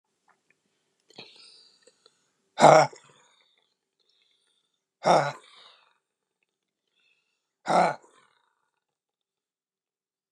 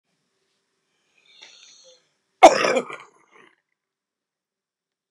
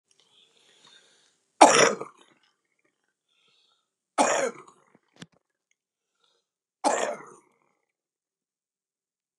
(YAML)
exhalation_length: 10.3 s
exhalation_amplitude: 28543
exhalation_signal_mean_std_ratio: 0.2
cough_length: 5.1 s
cough_amplitude: 32768
cough_signal_mean_std_ratio: 0.17
three_cough_length: 9.4 s
three_cough_amplitude: 32200
three_cough_signal_mean_std_ratio: 0.22
survey_phase: beta (2021-08-13 to 2022-03-07)
age: 65+
gender: Male
wearing_mask: 'No'
symptom_shortness_of_breath: true
symptom_abdominal_pain: true
smoker_status: Ex-smoker
respiratory_condition_asthma: true
respiratory_condition_other: true
recruitment_source: REACT
submission_delay: 0 days
covid_test_result: Negative
covid_test_method: RT-qPCR
influenza_a_test_result: Negative
influenza_b_test_result: Negative